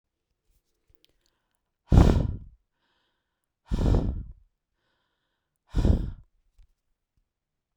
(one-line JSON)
{"exhalation_length": "7.8 s", "exhalation_amplitude": 18075, "exhalation_signal_mean_std_ratio": 0.29, "survey_phase": "beta (2021-08-13 to 2022-03-07)", "age": "65+", "gender": "Female", "wearing_mask": "No", "symptom_none": true, "smoker_status": "Ex-smoker", "respiratory_condition_asthma": false, "respiratory_condition_other": false, "recruitment_source": "REACT", "submission_delay": "0 days", "covid_test_result": "Negative", "covid_test_method": "RT-qPCR"}